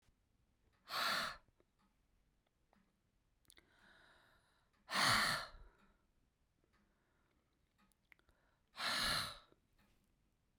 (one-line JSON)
{"exhalation_length": "10.6 s", "exhalation_amplitude": 2888, "exhalation_signal_mean_std_ratio": 0.32, "survey_phase": "beta (2021-08-13 to 2022-03-07)", "age": "45-64", "gender": "Female", "wearing_mask": "No", "symptom_cough_any": true, "symptom_fatigue": true, "symptom_headache": true, "symptom_change_to_sense_of_smell_or_taste": true, "symptom_loss_of_taste": true, "symptom_other": true, "symptom_onset": "7 days", "smoker_status": "Never smoked", "respiratory_condition_asthma": false, "respiratory_condition_other": false, "recruitment_source": "Test and Trace", "submission_delay": "5 days", "covid_test_result": "Negative", "covid_test_method": "RT-qPCR"}